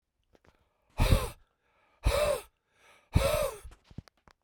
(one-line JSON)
{"exhalation_length": "4.4 s", "exhalation_amplitude": 10740, "exhalation_signal_mean_std_ratio": 0.39, "survey_phase": "beta (2021-08-13 to 2022-03-07)", "age": "45-64", "gender": "Male", "wearing_mask": "No", "symptom_cough_any": true, "symptom_runny_or_blocked_nose": true, "symptom_fatigue": true, "symptom_change_to_sense_of_smell_or_taste": true, "symptom_onset": "3 days", "smoker_status": "Ex-smoker", "respiratory_condition_asthma": false, "respiratory_condition_other": false, "recruitment_source": "Test and Trace", "submission_delay": "1 day", "covid_test_result": "Positive", "covid_test_method": "RT-qPCR"}